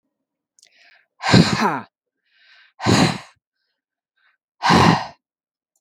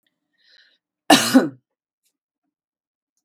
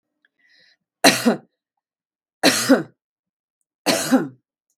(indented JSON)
{
  "exhalation_length": "5.8 s",
  "exhalation_amplitude": 32768,
  "exhalation_signal_mean_std_ratio": 0.36,
  "cough_length": "3.2 s",
  "cough_amplitude": 32768,
  "cough_signal_mean_std_ratio": 0.24,
  "three_cough_length": "4.8 s",
  "three_cough_amplitude": 32768,
  "three_cough_signal_mean_std_ratio": 0.34,
  "survey_phase": "beta (2021-08-13 to 2022-03-07)",
  "age": "65+",
  "gender": "Female",
  "wearing_mask": "No",
  "symptom_none": true,
  "smoker_status": "Ex-smoker",
  "respiratory_condition_asthma": false,
  "respiratory_condition_other": false,
  "recruitment_source": "REACT",
  "submission_delay": "3 days",
  "covid_test_result": "Negative",
  "covid_test_method": "RT-qPCR"
}